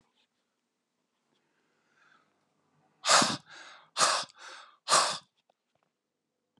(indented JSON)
{
  "exhalation_length": "6.6 s",
  "exhalation_amplitude": 11209,
  "exhalation_signal_mean_std_ratio": 0.28,
  "survey_phase": "beta (2021-08-13 to 2022-03-07)",
  "age": "45-64",
  "gender": "Male",
  "wearing_mask": "No",
  "symptom_none": true,
  "smoker_status": "Current smoker (e-cigarettes or vapes only)",
  "respiratory_condition_asthma": false,
  "respiratory_condition_other": false,
  "recruitment_source": "REACT",
  "submission_delay": "2 days",
  "covid_test_result": "Negative",
  "covid_test_method": "RT-qPCR",
  "influenza_a_test_result": "Negative",
  "influenza_b_test_result": "Negative"
}